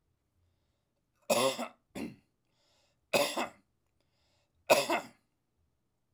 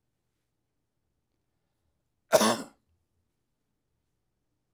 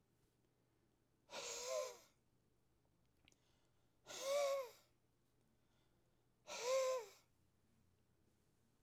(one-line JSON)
{"three_cough_length": "6.1 s", "three_cough_amplitude": 9656, "three_cough_signal_mean_std_ratio": 0.3, "cough_length": "4.7 s", "cough_amplitude": 16265, "cough_signal_mean_std_ratio": 0.17, "exhalation_length": "8.8 s", "exhalation_amplitude": 949, "exhalation_signal_mean_std_ratio": 0.38, "survey_phase": "beta (2021-08-13 to 2022-03-07)", "age": "45-64", "gender": "Male", "wearing_mask": "No", "symptom_none": true, "smoker_status": "Ex-smoker", "respiratory_condition_asthma": false, "respiratory_condition_other": false, "recruitment_source": "REACT", "submission_delay": "1 day", "covid_test_result": "Negative", "covid_test_method": "RT-qPCR", "influenza_a_test_result": "Negative", "influenza_b_test_result": "Negative"}